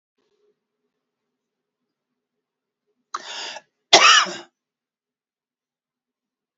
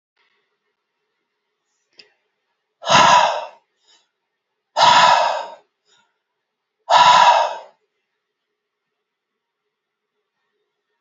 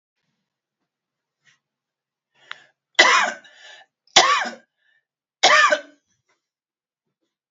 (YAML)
cough_length: 6.6 s
cough_amplitude: 30909
cough_signal_mean_std_ratio: 0.2
exhalation_length: 11.0 s
exhalation_amplitude: 30093
exhalation_signal_mean_std_ratio: 0.33
three_cough_length: 7.5 s
three_cough_amplitude: 32767
three_cough_signal_mean_std_ratio: 0.28
survey_phase: beta (2021-08-13 to 2022-03-07)
age: 65+
gender: Male
wearing_mask: 'No'
symptom_none: true
smoker_status: Never smoked
respiratory_condition_asthma: false
respiratory_condition_other: false
recruitment_source: REACT
submission_delay: 7 days
covid_test_result: Negative
covid_test_method: RT-qPCR
influenza_a_test_result: Negative
influenza_b_test_result: Negative